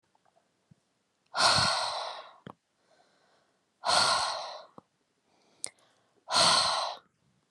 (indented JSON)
{
  "exhalation_length": "7.5 s",
  "exhalation_amplitude": 10719,
  "exhalation_signal_mean_std_ratio": 0.42,
  "survey_phase": "beta (2021-08-13 to 2022-03-07)",
  "age": "45-64",
  "gender": "Female",
  "wearing_mask": "No",
  "symptom_none": true,
  "symptom_onset": "8 days",
  "smoker_status": "Ex-smoker",
  "respiratory_condition_asthma": false,
  "respiratory_condition_other": false,
  "recruitment_source": "REACT",
  "submission_delay": "1 day",
  "covid_test_result": "Negative",
  "covid_test_method": "RT-qPCR"
}